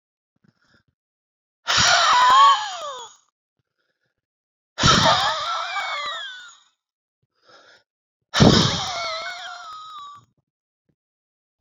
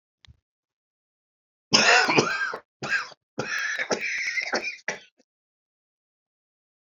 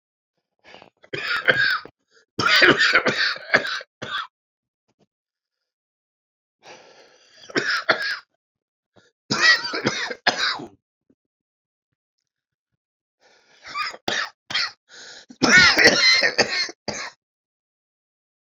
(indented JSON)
{
  "exhalation_length": "11.6 s",
  "exhalation_amplitude": 30048,
  "exhalation_signal_mean_std_ratio": 0.42,
  "cough_length": "6.8 s",
  "cough_amplitude": 25992,
  "cough_signal_mean_std_ratio": 0.42,
  "three_cough_length": "18.5 s",
  "three_cough_amplitude": 31824,
  "three_cough_signal_mean_std_ratio": 0.39,
  "survey_phase": "beta (2021-08-13 to 2022-03-07)",
  "age": "45-64",
  "gender": "Male",
  "wearing_mask": "No",
  "symptom_cough_any": true,
  "symptom_new_continuous_cough": true,
  "symptom_shortness_of_breath": true,
  "symptom_fatigue": true,
  "symptom_headache": true,
  "symptom_change_to_sense_of_smell_or_taste": true,
  "symptom_onset": "6 days",
  "smoker_status": "Ex-smoker",
  "respiratory_condition_asthma": true,
  "respiratory_condition_other": false,
  "recruitment_source": "Test and Trace",
  "submission_delay": "3 days",
  "covid_test_result": "Positive",
  "covid_test_method": "RT-qPCR",
  "covid_ct_value": 16.2,
  "covid_ct_gene": "ORF1ab gene",
  "covid_ct_mean": 16.7,
  "covid_viral_load": "3300000 copies/ml",
  "covid_viral_load_category": "High viral load (>1M copies/ml)"
}